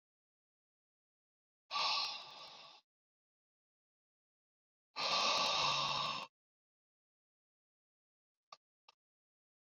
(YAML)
exhalation_length: 9.7 s
exhalation_amplitude: 2581
exhalation_signal_mean_std_ratio: 0.36
survey_phase: beta (2021-08-13 to 2022-03-07)
age: 65+
gender: Male
wearing_mask: 'No'
symptom_none: true
smoker_status: Never smoked
respiratory_condition_asthma: false
respiratory_condition_other: false
recruitment_source: REACT
submission_delay: 1 day
covid_test_result: Negative
covid_test_method: RT-qPCR
influenza_a_test_result: Negative
influenza_b_test_result: Negative